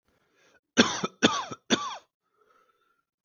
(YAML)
three_cough_length: 3.2 s
three_cough_amplitude: 21425
three_cough_signal_mean_std_ratio: 0.3
survey_phase: beta (2021-08-13 to 2022-03-07)
age: 18-44
gender: Male
wearing_mask: 'No'
symptom_cough_any: true
symptom_sore_throat: true
symptom_headache: true
smoker_status: Ex-smoker
respiratory_condition_asthma: false
respiratory_condition_other: false
recruitment_source: Test and Trace
submission_delay: 2 days
covid_test_result: Positive
covid_test_method: RT-qPCR
covid_ct_value: 20.9
covid_ct_gene: N gene